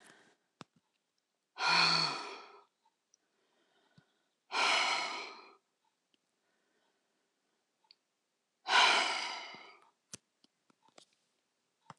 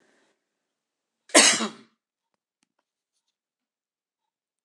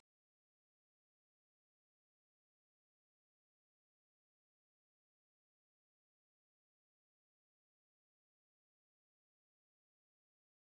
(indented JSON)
{
  "exhalation_length": "12.0 s",
  "exhalation_amplitude": 7097,
  "exhalation_signal_mean_std_ratio": 0.33,
  "cough_length": "4.6 s",
  "cough_amplitude": 23881,
  "cough_signal_mean_std_ratio": 0.19,
  "three_cough_length": "10.7 s",
  "three_cough_amplitude": 18,
  "three_cough_signal_mean_std_ratio": 0.01,
  "survey_phase": "beta (2021-08-13 to 2022-03-07)",
  "age": "65+",
  "gender": "Female",
  "wearing_mask": "No",
  "symptom_none": true,
  "smoker_status": "Never smoked",
  "respiratory_condition_asthma": false,
  "respiratory_condition_other": false,
  "recruitment_source": "REACT",
  "submission_delay": "2 days",
  "covid_test_result": "Negative",
  "covid_test_method": "RT-qPCR",
  "influenza_a_test_result": "Negative",
  "influenza_b_test_result": "Negative"
}